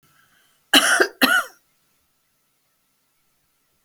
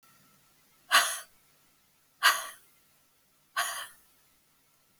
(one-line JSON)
{"cough_length": "3.8 s", "cough_amplitude": 32767, "cough_signal_mean_std_ratio": 0.29, "exhalation_length": "5.0 s", "exhalation_amplitude": 13032, "exhalation_signal_mean_std_ratio": 0.27, "survey_phase": "beta (2021-08-13 to 2022-03-07)", "age": "65+", "gender": "Female", "wearing_mask": "No", "symptom_none": true, "smoker_status": "Never smoked", "respiratory_condition_asthma": false, "respiratory_condition_other": false, "recruitment_source": "REACT", "submission_delay": "1 day", "covid_test_result": "Negative", "covid_test_method": "RT-qPCR"}